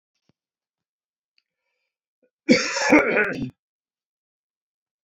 {"cough_length": "5.0 s", "cough_amplitude": 25968, "cough_signal_mean_std_ratio": 0.3, "survey_phase": "beta (2021-08-13 to 2022-03-07)", "age": "45-64", "gender": "Male", "wearing_mask": "No", "symptom_none": true, "smoker_status": "Never smoked", "respiratory_condition_asthma": false, "respiratory_condition_other": false, "recruitment_source": "REACT", "submission_delay": "1 day", "covid_test_result": "Negative", "covid_test_method": "RT-qPCR"}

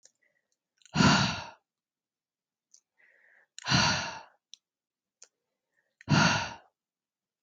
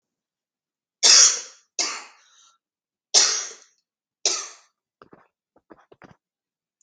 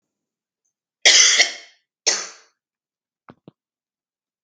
{"exhalation_length": "7.4 s", "exhalation_amplitude": 10221, "exhalation_signal_mean_std_ratio": 0.32, "three_cough_length": "6.8 s", "three_cough_amplitude": 32768, "three_cough_signal_mean_std_ratio": 0.27, "cough_length": "4.4 s", "cough_amplitude": 32768, "cough_signal_mean_std_ratio": 0.28, "survey_phase": "beta (2021-08-13 to 2022-03-07)", "age": "45-64", "gender": "Female", "wearing_mask": "No", "symptom_runny_or_blocked_nose": true, "symptom_sore_throat": true, "symptom_abdominal_pain": true, "symptom_onset": "8 days", "smoker_status": "Never smoked", "respiratory_condition_asthma": false, "respiratory_condition_other": false, "recruitment_source": "REACT", "submission_delay": "2 days", "covid_test_result": "Positive", "covid_test_method": "RT-qPCR", "covid_ct_value": 22.6, "covid_ct_gene": "E gene", "influenza_a_test_result": "Negative", "influenza_b_test_result": "Negative"}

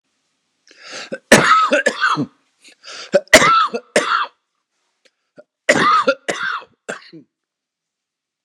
{"three_cough_length": "8.4 s", "three_cough_amplitude": 32768, "three_cough_signal_mean_std_ratio": 0.42, "survey_phase": "beta (2021-08-13 to 2022-03-07)", "age": "65+", "gender": "Male", "wearing_mask": "No", "symptom_cough_any": true, "symptom_runny_or_blocked_nose": true, "symptom_headache": true, "symptom_onset": "4 days", "smoker_status": "Never smoked", "respiratory_condition_asthma": false, "respiratory_condition_other": false, "recruitment_source": "Test and Trace", "submission_delay": "2 days", "covid_test_result": "Negative", "covid_test_method": "RT-qPCR"}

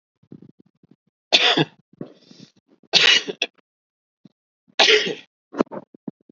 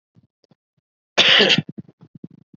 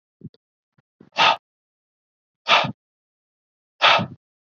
{"three_cough_length": "6.3 s", "three_cough_amplitude": 30699, "three_cough_signal_mean_std_ratio": 0.32, "cough_length": "2.6 s", "cough_amplitude": 28184, "cough_signal_mean_std_ratio": 0.34, "exhalation_length": "4.5 s", "exhalation_amplitude": 27602, "exhalation_signal_mean_std_ratio": 0.29, "survey_phase": "beta (2021-08-13 to 2022-03-07)", "age": "45-64", "gender": "Male", "wearing_mask": "No", "symptom_none": true, "smoker_status": "Never smoked", "respiratory_condition_asthma": false, "respiratory_condition_other": false, "recruitment_source": "REACT", "submission_delay": "1 day", "covid_test_result": "Negative", "covid_test_method": "RT-qPCR", "influenza_a_test_result": "Negative", "influenza_b_test_result": "Negative"}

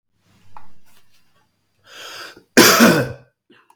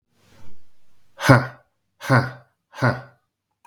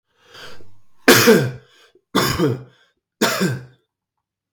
{"cough_length": "3.8 s", "cough_amplitude": 32768, "cough_signal_mean_std_ratio": 0.35, "exhalation_length": "3.7 s", "exhalation_amplitude": 32766, "exhalation_signal_mean_std_ratio": 0.36, "three_cough_length": "4.5 s", "three_cough_amplitude": 32768, "three_cough_signal_mean_std_ratio": 0.42, "survey_phase": "beta (2021-08-13 to 2022-03-07)", "age": "18-44", "gender": "Male", "wearing_mask": "No", "symptom_cough_any": true, "symptom_sore_throat": true, "symptom_fatigue": true, "symptom_headache": true, "symptom_onset": "3 days", "smoker_status": "Never smoked", "respiratory_condition_asthma": false, "respiratory_condition_other": false, "recruitment_source": "Test and Trace", "submission_delay": "2 days", "covid_test_result": "Positive", "covid_test_method": "RT-qPCR", "covid_ct_value": 24.8, "covid_ct_gene": "N gene"}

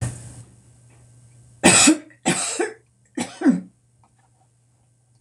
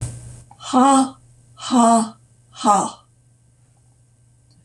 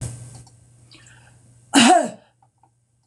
{"three_cough_length": "5.2 s", "three_cough_amplitude": 26028, "three_cough_signal_mean_std_ratio": 0.36, "exhalation_length": "4.6 s", "exhalation_amplitude": 25886, "exhalation_signal_mean_std_ratio": 0.43, "cough_length": "3.1 s", "cough_amplitude": 25966, "cough_signal_mean_std_ratio": 0.31, "survey_phase": "beta (2021-08-13 to 2022-03-07)", "age": "65+", "gender": "Female", "wearing_mask": "No", "symptom_none": true, "smoker_status": "Never smoked", "respiratory_condition_asthma": false, "respiratory_condition_other": false, "recruitment_source": "REACT", "submission_delay": "2 days", "covid_test_result": "Negative", "covid_test_method": "RT-qPCR", "influenza_a_test_result": "Negative", "influenza_b_test_result": "Negative"}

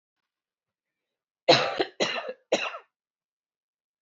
{"three_cough_length": "4.0 s", "three_cough_amplitude": 19120, "three_cough_signal_mean_std_ratio": 0.3, "survey_phase": "beta (2021-08-13 to 2022-03-07)", "age": "18-44", "gender": "Female", "wearing_mask": "No", "symptom_none": true, "smoker_status": "Current smoker (11 or more cigarettes per day)", "respiratory_condition_asthma": false, "respiratory_condition_other": false, "recruitment_source": "REACT", "submission_delay": "3 days", "covid_test_result": "Negative", "covid_test_method": "RT-qPCR", "influenza_a_test_result": "Negative", "influenza_b_test_result": "Negative"}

